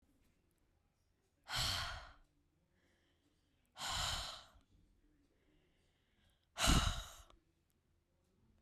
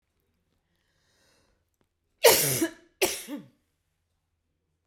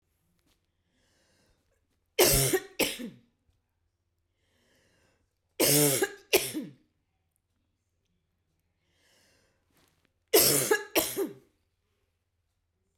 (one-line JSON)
{"exhalation_length": "8.6 s", "exhalation_amplitude": 3873, "exhalation_signal_mean_std_ratio": 0.32, "cough_length": "4.9 s", "cough_amplitude": 21036, "cough_signal_mean_std_ratio": 0.26, "three_cough_length": "13.0 s", "three_cough_amplitude": 16812, "three_cough_signal_mean_std_ratio": 0.31, "survey_phase": "beta (2021-08-13 to 2022-03-07)", "age": "45-64", "gender": "Female", "wearing_mask": "No", "symptom_none": true, "smoker_status": "Ex-smoker", "respiratory_condition_asthma": false, "respiratory_condition_other": false, "recruitment_source": "REACT", "submission_delay": "1 day", "covid_test_result": "Negative", "covid_test_method": "RT-qPCR"}